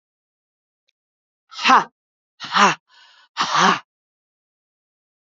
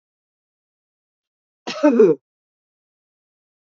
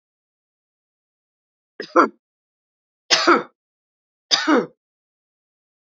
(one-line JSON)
{"exhalation_length": "5.2 s", "exhalation_amplitude": 28937, "exhalation_signal_mean_std_ratio": 0.3, "cough_length": "3.7 s", "cough_amplitude": 24567, "cough_signal_mean_std_ratio": 0.25, "three_cough_length": "5.8 s", "three_cough_amplitude": 32768, "three_cough_signal_mean_std_ratio": 0.26, "survey_phase": "beta (2021-08-13 to 2022-03-07)", "age": "65+", "gender": "Female", "wearing_mask": "No", "symptom_runny_or_blocked_nose": true, "symptom_sore_throat": true, "symptom_abdominal_pain": true, "symptom_fatigue": true, "smoker_status": "Never smoked", "respiratory_condition_asthma": false, "respiratory_condition_other": false, "recruitment_source": "Test and Trace", "submission_delay": "0 days", "covid_test_result": "Positive", "covid_test_method": "LFT"}